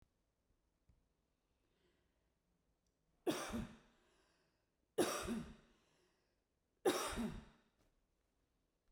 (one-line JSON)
{"three_cough_length": "8.9 s", "three_cough_amplitude": 2664, "three_cough_signal_mean_std_ratio": 0.31, "survey_phase": "beta (2021-08-13 to 2022-03-07)", "age": "45-64", "gender": "Female", "wearing_mask": "No", "symptom_none": true, "smoker_status": "Never smoked", "respiratory_condition_asthma": false, "respiratory_condition_other": false, "recruitment_source": "REACT", "submission_delay": "2 days", "covid_test_result": "Negative", "covid_test_method": "RT-qPCR"}